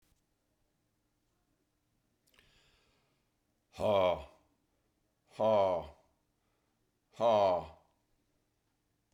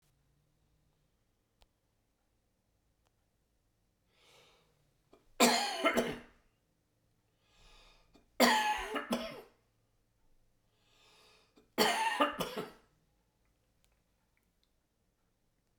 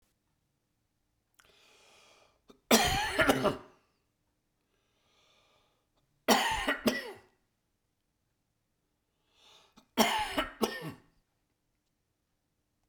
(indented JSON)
{
  "exhalation_length": "9.1 s",
  "exhalation_amplitude": 5148,
  "exhalation_signal_mean_std_ratio": 0.31,
  "three_cough_length": "15.8 s",
  "three_cough_amplitude": 9622,
  "three_cough_signal_mean_std_ratio": 0.29,
  "cough_length": "12.9 s",
  "cough_amplitude": 14693,
  "cough_signal_mean_std_ratio": 0.31,
  "survey_phase": "beta (2021-08-13 to 2022-03-07)",
  "age": "65+",
  "gender": "Male",
  "wearing_mask": "No",
  "symptom_none": true,
  "smoker_status": "Never smoked",
  "respiratory_condition_asthma": false,
  "respiratory_condition_other": false,
  "recruitment_source": "REACT",
  "submission_delay": "2 days",
  "covid_test_result": "Negative",
  "covid_test_method": "RT-qPCR"
}